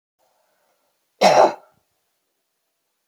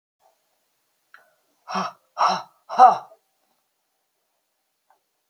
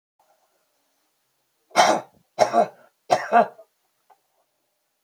cough_length: 3.1 s
cough_amplitude: 28992
cough_signal_mean_std_ratio: 0.25
exhalation_length: 5.3 s
exhalation_amplitude: 27814
exhalation_signal_mean_std_ratio: 0.23
three_cough_length: 5.0 s
three_cough_amplitude: 26098
three_cough_signal_mean_std_ratio: 0.3
survey_phase: beta (2021-08-13 to 2022-03-07)
age: 45-64
gender: Female
wearing_mask: 'No'
symptom_cough_any: true
symptom_new_continuous_cough: true
symptom_sore_throat: true
symptom_onset: 5 days
smoker_status: Never smoked
respiratory_condition_asthma: false
respiratory_condition_other: false
recruitment_source: Test and Trace
submission_delay: 1 day
covid_test_method: ePCR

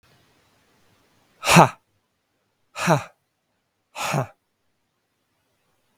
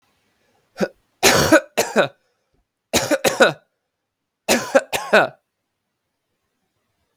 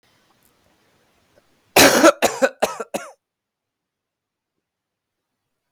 exhalation_length: 6.0 s
exhalation_amplitude: 32768
exhalation_signal_mean_std_ratio: 0.23
three_cough_length: 7.2 s
three_cough_amplitude: 32768
three_cough_signal_mean_std_ratio: 0.35
cough_length: 5.7 s
cough_amplitude: 32768
cough_signal_mean_std_ratio: 0.26
survey_phase: alpha (2021-03-01 to 2021-08-12)
age: 18-44
gender: Male
wearing_mask: 'No'
symptom_cough_any: true
symptom_fatigue: true
symptom_headache: true
symptom_onset: 3 days
smoker_status: Never smoked
respiratory_condition_asthma: false
respiratory_condition_other: false
recruitment_source: Test and Trace
submission_delay: 1 day
covid_test_result: Positive
covid_test_method: RT-qPCR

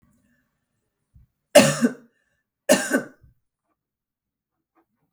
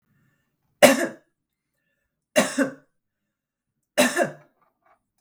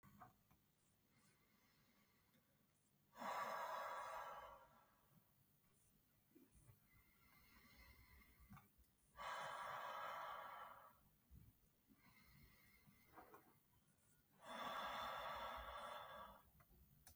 cough_length: 5.1 s
cough_amplitude: 32768
cough_signal_mean_std_ratio: 0.24
three_cough_length: 5.2 s
three_cough_amplitude: 32768
three_cough_signal_mean_std_ratio: 0.27
exhalation_length: 17.2 s
exhalation_amplitude: 435
exhalation_signal_mean_std_ratio: 0.56
survey_phase: beta (2021-08-13 to 2022-03-07)
age: 18-44
gender: Female
wearing_mask: 'No'
symptom_none: true
symptom_onset: 4 days
smoker_status: Current smoker (1 to 10 cigarettes per day)
respiratory_condition_asthma: false
respiratory_condition_other: false
recruitment_source: Test and Trace
submission_delay: 1 day
covid_test_result: Negative
covid_test_method: RT-qPCR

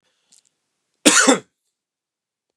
cough_length: 2.6 s
cough_amplitude: 31519
cough_signal_mean_std_ratio: 0.27
survey_phase: beta (2021-08-13 to 2022-03-07)
age: 45-64
gender: Male
wearing_mask: 'No'
symptom_none: true
smoker_status: Never smoked
respiratory_condition_asthma: false
respiratory_condition_other: false
recruitment_source: REACT
submission_delay: 2 days
covid_test_result: Negative
covid_test_method: RT-qPCR
influenza_a_test_result: Negative
influenza_b_test_result: Negative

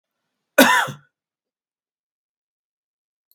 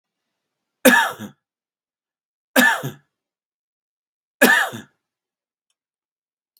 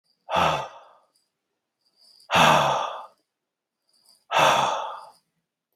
cough_length: 3.3 s
cough_amplitude: 32767
cough_signal_mean_std_ratio: 0.22
three_cough_length: 6.6 s
three_cough_amplitude: 32768
three_cough_signal_mean_std_ratio: 0.27
exhalation_length: 5.8 s
exhalation_amplitude: 18292
exhalation_signal_mean_std_ratio: 0.42
survey_phase: beta (2021-08-13 to 2022-03-07)
age: 65+
gender: Male
wearing_mask: 'No'
symptom_none: true
smoker_status: Never smoked
respiratory_condition_asthma: false
respiratory_condition_other: false
recruitment_source: REACT
submission_delay: 1 day
covid_test_result: Negative
covid_test_method: RT-qPCR
influenza_a_test_result: Unknown/Void
influenza_b_test_result: Unknown/Void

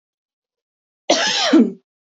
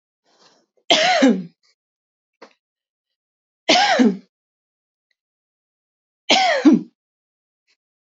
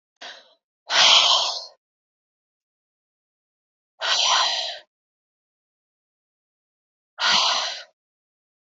cough_length: 2.1 s
cough_amplitude: 27192
cough_signal_mean_std_ratio: 0.42
three_cough_length: 8.2 s
three_cough_amplitude: 30233
three_cough_signal_mean_std_ratio: 0.34
exhalation_length: 8.6 s
exhalation_amplitude: 26159
exhalation_signal_mean_std_ratio: 0.37
survey_phase: beta (2021-08-13 to 2022-03-07)
age: 18-44
gender: Female
wearing_mask: 'No'
symptom_none: true
smoker_status: Ex-smoker
respiratory_condition_asthma: false
respiratory_condition_other: false
recruitment_source: REACT
submission_delay: 1 day
covid_test_result: Negative
covid_test_method: RT-qPCR
influenza_a_test_result: Negative
influenza_b_test_result: Negative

